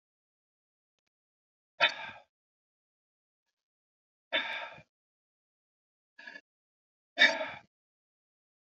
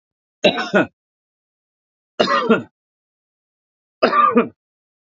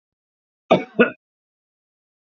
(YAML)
exhalation_length: 8.7 s
exhalation_amplitude: 11530
exhalation_signal_mean_std_ratio: 0.2
three_cough_length: 5.0 s
three_cough_amplitude: 32767
three_cough_signal_mean_std_ratio: 0.37
cough_length: 2.3 s
cough_amplitude: 28861
cough_signal_mean_std_ratio: 0.22
survey_phase: beta (2021-08-13 to 2022-03-07)
age: 45-64
gender: Male
wearing_mask: 'No'
symptom_none: true
symptom_onset: 5 days
smoker_status: Never smoked
respiratory_condition_asthma: false
respiratory_condition_other: false
recruitment_source: REACT
submission_delay: 1 day
covid_test_result: Negative
covid_test_method: RT-qPCR
influenza_a_test_result: Negative
influenza_b_test_result: Negative